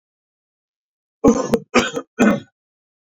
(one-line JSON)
{"cough_length": "3.2 s", "cough_amplitude": 28202, "cough_signal_mean_std_ratio": 0.35, "survey_phase": "beta (2021-08-13 to 2022-03-07)", "age": "45-64", "gender": "Male", "wearing_mask": "No", "symptom_none": true, "symptom_onset": "9 days", "smoker_status": "Never smoked", "respiratory_condition_asthma": false, "respiratory_condition_other": false, "recruitment_source": "REACT", "submission_delay": "1 day", "covid_test_result": "Negative", "covid_test_method": "RT-qPCR", "influenza_a_test_result": "Unknown/Void", "influenza_b_test_result": "Unknown/Void"}